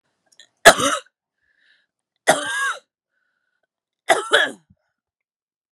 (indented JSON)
{
  "three_cough_length": "5.7 s",
  "three_cough_amplitude": 32768,
  "three_cough_signal_mean_std_ratio": 0.27,
  "survey_phase": "beta (2021-08-13 to 2022-03-07)",
  "age": "45-64",
  "gender": "Female",
  "wearing_mask": "No",
  "symptom_new_continuous_cough": true,
  "symptom_runny_or_blocked_nose": true,
  "symptom_sore_throat": true,
  "symptom_fatigue": true,
  "symptom_headache": true,
  "symptom_change_to_sense_of_smell_or_taste": true,
  "smoker_status": "Never smoked",
  "respiratory_condition_asthma": false,
  "respiratory_condition_other": false,
  "recruitment_source": "Test and Trace",
  "submission_delay": "1 day",
  "covid_test_result": "Positive",
  "covid_test_method": "RT-qPCR"
}